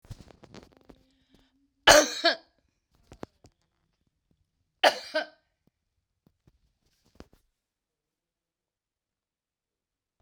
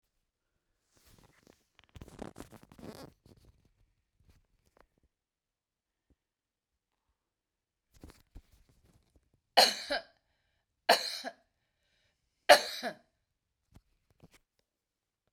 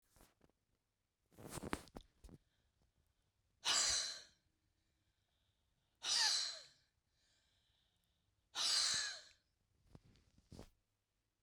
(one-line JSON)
{"cough_length": "10.2 s", "cough_amplitude": 28088, "cough_signal_mean_std_ratio": 0.17, "three_cough_length": "15.3 s", "three_cough_amplitude": 19265, "three_cough_signal_mean_std_ratio": 0.16, "exhalation_length": "11.4 s", "exhalation_amplitude": 2714, "exhalation_signal_mean_std_ratio": 0.34, "survey_phase": "beta (2021-08-13 to 2022-03-07)", "age": "65+", "gender": "Female", "wearing_mask": "No", "symptom_cough_any": true, "smoker_status": "Never smoked", "respiratory_condition_asthma": false, "respiratory_condition_other": false, "recruitment_source": "REACT", "submission_delay": "1 day", "covid_test_result": "Negative", "covid_test_method": "RT-qPCR"}